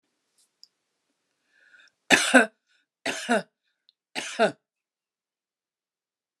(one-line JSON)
{"three_cough_length": "6.4 s", "three_cough_amplitude": 25861, "three_cough_signal_mean_std_ratio": 0.24, "survey_phase": "alpha (2021-03-01 to 2021-08-12)", "age": "45-64", "gender": "Female", "wearing_mask": "No", "symptom_none": true, "smoker_status": "Never smoked", "respiratory_condition_asthma": false, "respiratory_condition_other": false, "recruitment_source": "REACT", "submission_delay": "2 days", "covid_test_result": "Negative", "covid_test_method": "RT-qPCR"}